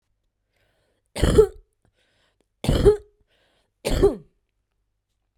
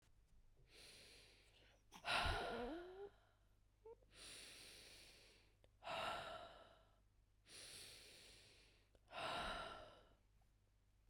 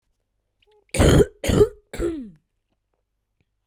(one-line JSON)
{"three_cough_length": "5.4 s", "three_cough_amplitude": 27518, "three_cough_signal_mean_std_ratio": 0.31, "exhalation_length": "11.1 s", "exhalation_amplitude": 1320, "exhalation_signal_mean_std_ratio": 0.49, "cough_length": "3.7 s", "cough_amplitude": 21712, "cough_signal_mean_std_ratio": 0.35, "survey_phase": "beta (2021-08-13 to 2022-03-07)", "age": "18-44", "gender": "Female", "wearing_mask": "Yes", "symptom_cough_any": true, "symptom_runny_or_blocked_nose": true, "smoker_status": "Ex-smoker", "respiratory_condition_asthma": false, "respiratory_condition_other": false, "recruitment_source": "REACT", "submission_delay": "1 day", "covid_test_result": "Negative", "covid_test_method": "RT-qPCR", "influenza_a_test_result": "Unknown/Void", "influenza_b_test_result": "Unknown/Void"}